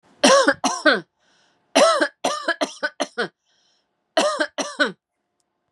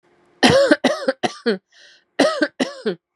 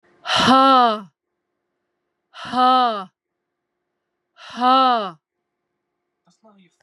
{
  "three_cough_length": "5.7 s",
  "three_cough_amplitude": 27580,
  "three_cough_signal_mean_std_ratio": 0.44,
  "cough_length": "3.2 s",
  "cough_amplitude": 32433,
  "cough_signal_mean_std_ratio": 0.48,
  "exhalation_length": "6.8 s",
  "exhalation_amplitude": 28767,
  "exhalation_signal_mean_std_ratio": 0.39,
  "survey_phase": "beta (2021-08-13 to 2022-03-07)",
  "age": "45-64",
  "gender": "Female",
  "wearing_mask": "No",
  "symptom_fatigue": true,
  "symptom_headache": true,
  "symptom_onset": "9 days",
  "smoker_status": "Never smoked",
  "respiratory_condition_asthma": false,
  "respiratory_condition_other": false,
  "recruitment_source": "Test and Trace",
  "submission_delay": "5 days",
  "covid_test_result": "Positive",
  "covid_test_method": "RT-qPCR",
  "covid_ct_value": 20.3,
  "covid_ct_gene": "N gene",
  "covid_ct_mean": 20.6,
  "covid_viral_load": "170000 copies/ml",
  "covid_viral_load_category": "Low viral load (10K-1M copies/ml)"
}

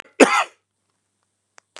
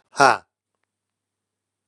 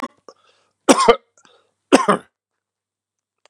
{
  "cough_length": "1.8 s",
  "cough_amplitude": 32768,
  "cough_signal_mean_std_ratio": 0.25,
  "exhalation_length": "1.9 s",
  "exhalation_amplitude": 32745,
  "exhalation_signal_mean_std_ratio": 0.2,
  "three_cough_length": "3.5 s",
  "three_cough_amplitude": 32768,
  "three_cough_signal_mean_std_ratio": 0.26,
  "survey_phase": "beta (2021-08-13 to 2022-03-07)",
  "age": "45-64",
  "gender": "Male",
  "wearing_mask": "No",
  "symptom_cough_any": true,
  "symptom_runny_or_blocked_nose": true,
  "symptom_fatigue": true,
  "symptom_fever_high_temperature": true,
  "symptom_headache": true,
  "symptom_onset": "3 days",
  "smoker_status": "Never smoked",
  "respiratory_condition_asthma": false,
  "respiratory_condition_other": false,
  "recruitment_source": "Test and Trace",
  "submission_delay": "2 days",
  "covid_test_result": "Positive",
  "covid_test_method": "RT-qPCR",
  "covid_ct_value": 27.8,
  "covid_ct_gene": "ORF1ab gene"
}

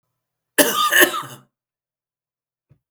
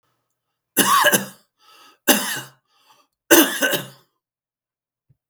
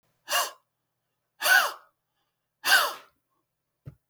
{
  "cough_length": "2.9 s",
  "cough_amplitude": 32768,
  "cough_signal_mean_std_ratio": 0.34,
  "three_cough_length": "5.3 s",
  "three_cough_amplitude": 32768,
  "three_cough_signal_mean_std_ratio": 0.36,
  "exhalation_length": "4.1 s",
  "exhalation_amplitude": 16286,
  "exhalation_signal_mean_std_ratio": 0.33,
  "survey_phase": "beta (2021-08-13 to 2022-03-07)",
  "age": "45-64",
  "gender": "Male",
  "wearing_mask": "No",
  "symptom_none": true,
  "smoker_status": "Ex-smoker",
  "respiratory_condition_asthma": false,
  "respiratory_condition_other": false,
  "recruitment_source": "REACT",
  "submission_delay": "2 days",
  "covid_test_result": "Negative",
  "covid_test_method": "RT-qPCR",
  "influenza_a_test_result": "Negative",
  "influenza_b_test_result": "Negative"
}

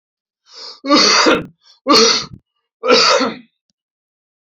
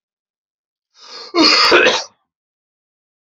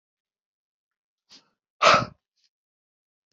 {
  "three_cough_length": "4.5 s",
  "three_cough_amplitude": 31724,
  "three_cough_signal_mean_std_ratio": 0.49,
  "cough_length": "3.2 s",
  "cough_amplitude": 32768,
  "cough_signal_mean_std_ratio": 0.39,
  "exhalation_length": "3.3 s",
  "exhalation_amplitude": 24373,
  "exhalation_signal_mean_std_ratio": 0.2,
  "survey_phase": "beta (2021-08-13 to 2022-03-07)",
  "age": "45-64",
  "gender": "Male",
  "wearing_mask": "No",
  "symptom_none": true,
  "smoker_status": "Never smoked",
  "respiratory_condition_asthma": false,
  "respiratory_condition_other": false,
  "recruitment_source": "REACT",
  "submission_delay": "2 days",
  "covid_test_result": "Negative",
  "covid_test_method": "RT-qPCR",
  "influenza_a_test_result": "Negative",
  "influenza_b_test_result": "Negative"
}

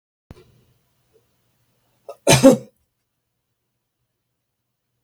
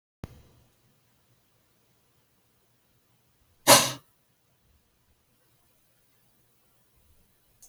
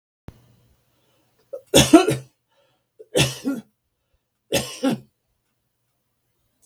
{
  "cough_length": "5.0 s",
  "cough_amplitude": 32766,
  "cough_signal_mean_std_ratio": 0.18,
  "exhalation_length": "7.7 s",
  "exhalation_amplitude": 31350,
  "exhalation_signal_mean_std_ratio": 0.14,
  "three_cough_length": "6.7 s",
  "three_cough_amplitude": 32766,
  "three_cough_signal_mean_std_ratio": 0.27,
  "survey_phase": "beta (2021-08-13 to 2022-03-07)",
  "age": "65+",
  "gender": "Male",
  "wearing_mask": "No",
  "symptom_shortness_of_breath": true,
  "smoker_status": "Never smoked",
  "respiratory_condition_asthma": false,
  "respiratory_condition_other": false,
  "recruitment_source": "REACT",
  "submission_delay": "2 days",
  "covid_test_result": "Negative",
  "covid_test_method": "RT-qPCR",
  "influenza_a_test_result": "Negative",
  "influenza_b_test_result": "Negative"
}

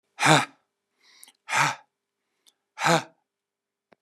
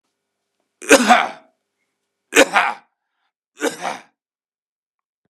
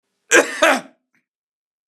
{
  "exhalation_length": "4.0 s",
  "exhalation_amplitude": 29419,
  "exhalation_signal_mean_std_ratio": 0.31,
  "three_cough_length": "5.3 s",
  "three_cough_amplitude": 32768,
  "three_cough_signal_mean_std_ratio": 0.29,
  "cough_length": "1.9 s",
  "cough_amplitude": 32767,
  "cough_signal_mean_std_ratio": 0.33,
  "survey_phase": "beta (2021-08-13 to 2022-03-07)",
  "age": "65+",
  "gender": "Male",
  "wearing_mask": "No",
  "symptom_cough_any": true,
  "smoker_status": "Never smoked",
  "respiratory_condition_asthma": false,
  "respiratory_condition_other": false,
  "recruitment_source": "REACT",
  "submission_delay": "2 days",
  "covid_test_result": "Negative",
  "covid_test_method": "RT-qPCR",
  "covid_ct_value": 44.0,
  "covid_ct_gene": "E gene"
}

